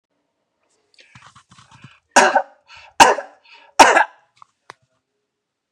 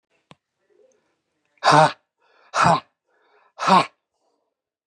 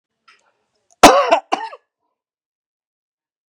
three_cough_length: 5.7 s
three_cough_amplitude: 32768
three_cough_signal_mean_std_ratio: 0.26
exhalation_length: 4.9 s
exhalation_amplitude: 27675
exhalation_signal_mean_std_ratio: 0.3
cough_length: 3.5 s
cough_amplitude: 32768
cough_signal_mean_std_ratio: 0.25
survey_phase: beta (2021-08-13 to 2022-03-07)
age: 65+
gender: Male
wearing_mask: 'No'
symptom_none: true
smoker_status: Never smoked
respiratory_condition_asthma: false
respiratory_condition_other: false
recruitment_source: REACT
submission_delay: 1 day
covid_test_result: Negative
covid_test_method: RT-qPCR
influenza_a_test_result: Negative
influenza_b_test_result: Negative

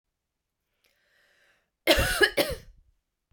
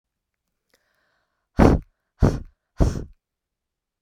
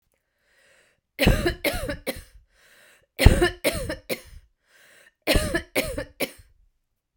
cough_length: 3.3 s
cough_amplitude: 19121
cough_signal_mean_std_ratio: 0.31
exhalation_length: 4.0 s
exhalation_amplitude: 32767
exhalation_signal_mean_std_ratio: 0.27
three_cough_length: 7.2 s
three_cough_amplitude: 32768
three_cough_signal_mean_std_ratio: 0.36
survey_phase: beta (2021-08-13 to 2022-03-07)
age: 18-44
gender: Female
wearing_mask: 'No'
symptom_cough_any: true
symptom_shortness_of_breath: true
symptom_fatigue: true
symptom_headache: true
smoker_status: Never smoked
respiratory_condition_asthma: true
respiratory_condition_other: false
recruitment_source: Test and Trace
submission_delay: 2 days
covid_test_result: Positive
covid_test_method: RT-qPCR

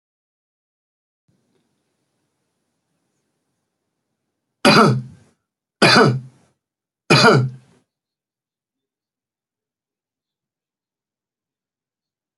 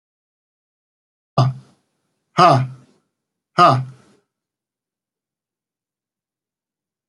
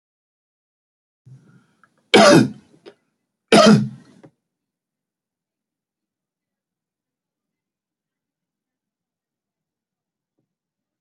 three_cough_length: 12.4 s
three_cough_amplitude: 29664
three_cough_signal_mean_std_ratio: 0.24
exhalation_length: 7.1 s
exhalation_amplitude: 27726
exhalation_signal_mean_std_ratio: 0.25
cough_length: 11.0 s
cough_amplitude: 31713
cough_signal_mean_std_ratio: 0.2
survey_phase: beta (2021-08-13 to 2022-03-07)
age: 65+
gender: Male
wearing_mask: 'No'
symptom_none: true
smoker_status: Never smoked
respiratory_condition_asthma: false
respiratory_condition_other: false
recruitment_source: Test and Trace
submission_delay: 2 days
covid_test_result: Negative
covid_test_method: LFT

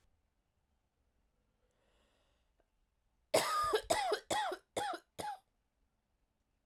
three_cough_length: 6.7 s
three_cough_amplitude: 5279
three_cough_signal_mean_std_ratio: 0.37
survey_phase: beta (2021-08-13 to 2022-03-07)
age: 18-44
gender: Female
wearing_mask: 'No'
symptom_cough_any: true
symptom_runny_or_blocked_nose: true
symptom_diarrhoea: true
symptom_fatigue: true
symptom_loss_of_taste: true
symptom_onset: 3 days
smoker_status: Never smoked
respiratory_condition_asthma: false
respiratory_condition_other: false
recruitment_source: Test and Trace
submission_delay: 1 day
covid_test_result: Positive
covid_test_method: RT-qPCR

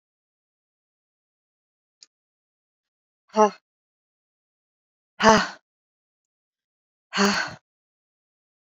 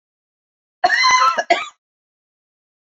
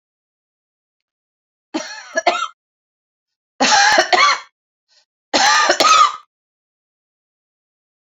exhalation_length: 8.6 s
exhalation_amplitude: 26341
exhalation_signal_mean_std_ratio: 0.2
cough_length: 2.9 s
cough_amplitude: 27889
cough_signal_mean_std_ratio: 0.4
three_cough_length: 8.0 s
three_cough_amplitude: 30042
three_cough_signal_mean_std_ratio: 0.39
survey_phase: beta (2021-08-13 to 2022-03-07)
age: 45-64
gender: Female
wearing_mask: 'No'
symptom_none: true
smoker_status: Never smoked
respiratory_condition_asthma: false
respiratory_condition_other: false
recruitment_source: Test and Trace
submission_delay: 2 days
covid_test_result: Positive
covid_test_method: RT-qPCR
covid_ct_value: 37.9
covid_ct_gene: N gene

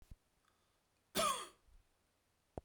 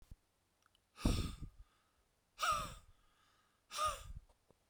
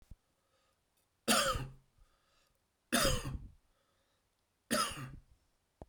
cough_length: 2.6 s
cough_amplitude: 1924
cough_signal_mean_std_ratio: 0.29
exhalation_length: 4.7 s
exhalation_amplitude: 2702
exhalation_signal_mean_std_ratio: 0.38
three_cough_length: 5.9 s
three_cough_amplitude: 6096
three_cough_signal_mean_std_ratio: 0.35
survey_phase: beta (2021-08-13 to 2022-03-07)
age: 45-64
gender: Male
wearing_mask: 'No'
symptom_none: true
smoker_status: Never smoked
respiratory_condition_asthma: false
respiratory_condition_other: false
recruitment_source: REACT
submission_delay: 1 day
covid_test_result: Negative
covid_test_method: RT-qPCR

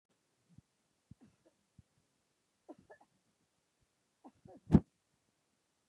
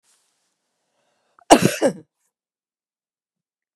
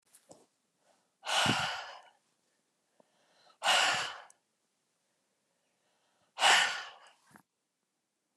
three_cough_length: 5.9 s
three_cough_amplitude: 9629
three_cough_signal_mean_std_ratio: 0.1
cough_length: 3.8 s
cough_amplitude: 32768
cough_signal_mean_std_ratio: 0.2
exhalation_length: 8.4 s
exhalation_amplitude: 9720
exhalation_signal_mean_std_ratio: 0.32
survey_phase: beta (2021-08-13 to 2022-03-07)
age: 65+
gender: Female
wearing_mask: 'No'
symptom_none: true
smoker_status: Never smoked
respiratory_condition_asthma: false
respiratory_condition_other: false
recruitment_source: REACT
submission_delay: 1 day
covid_test_result: Negative
covid_test_method: RT-qPCR
influenza_a_test_result: Negative
influenza_b_test_result: Negative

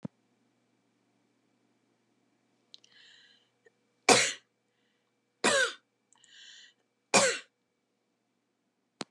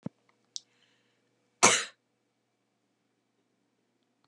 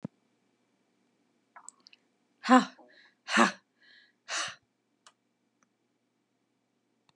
three_cough_length: 9.1 s
three_cough_amplitude: 15829
three_cough_signal_mean_std_ratio: 0.22
cough_length: 4.3 s
cough_amplitude: 22802
cough_signal_mean_std_ratio: 0.17
exhalation_length: 7.2 s
exhalation_amplitude: 14769
exhalation_signal_mean_std_ratio: 0.2
survey_phase: beta (2021-08-13 to 2022-03-07)
age: 65+
gender: Female
wearing_mask: 'No'
symptom_none: true
smoker_status: Ex-smoker
respiratory_condition_asthma: false
respiratory_condition_other: false
recruitment_source: REACT
submission_delay: 1 day
covid_test_result: Negative
covid_test_method: RT-qPCR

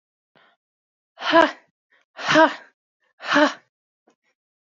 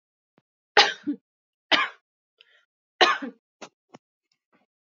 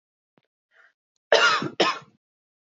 exhalation_length: 4.8 s
exhalation_amplitude: 26132
exhalation_signal_mean_std_ratio: 0.29
three_cough_length: 4.9 s
three_cough_amplitude: 26552
three_cough_signal_mean_std_ratio: 0.25
cough_length: 2.7 s
cough_amplitude: 27389
cough_signal_mean_std_ratio: 0.33
survey_phase: alpha (2021-03-01 to 2021-08-12)
age: 18-44
gender: Female
wearing_mask: 'No'
symptom_none: true
smoker_status: Never smoked
respiratory_condition_asthma: false
respiratory_condition_other: false
recruitment_source: REACT
submission_delay: 1 day
covid_test_result: Negative
covid_test_method: RT-qPCR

